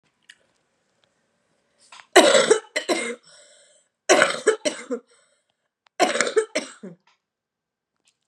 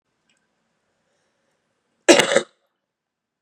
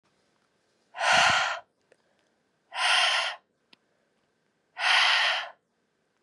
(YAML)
three_cough_length: 8.3 s
three_cough_amplitude: 32767
three_cough_signal_mean_std_ratio: 0.33
cough_length: 3.4 s
cough_amplitude: 32768
cough_signal_mean_std_ratio: 0.21
exhalation_length: 6.2 s
exhalation_amplitude: 13171
exhalation_signal_mean_std_ratio: 0.45
survey_phase: beta (2021-08-13 to 2022-03-07)
age: 18-44
gender: Female
wearing_mask: 'No'
symptom_cough_any: true
symptom_runny_or_blocked_nose: true
symptom_fatigue: true
symptom_fever_high_temperature: true
symptom_headache: true
symptom_onset: 2 days
smoker_status: Current smoker (1 to 10 cigarettes per day)
respiratory_condition_asthma: true
respiratory_condition_other: false
recruitment_source: Test and Trace
submission_delay: 1 day
covid_test_result: Positive
covid_test_method: RT-qPCR
covid_ct_value: 24.7
covid_ct_gene: N gene